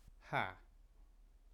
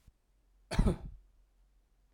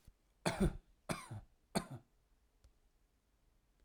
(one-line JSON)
{"exhalation_length": "1.5 s", "exhalation_amplitude": 2222, "exhalation_signal_mean_std_ratio": 0.38, "cough_length": "2.1 s", "cough_amplitude": 6664, "cough_signal_mean_std_ratio": 0.28, "three_cough_length": "3.8 s", "three_cough_amplitude": 3343, "three_cough_signal_mean_std_ratio": 0.3, "survey_phase": "alpha (2021-03-01 to 2021-08-12)", "age": "18-44", "gender": "Male", "wearing_mask": "No", "symptom_none": true, "smoker_status": "Ex-smoker", "respiratory_condition_asthma": false, "respiratory_condition_other": false, "recruitment_source": "REACT", "submission_delay": "2 days", "covid_test_result": "Negative", "covid_test_method": "RT-qPCR"}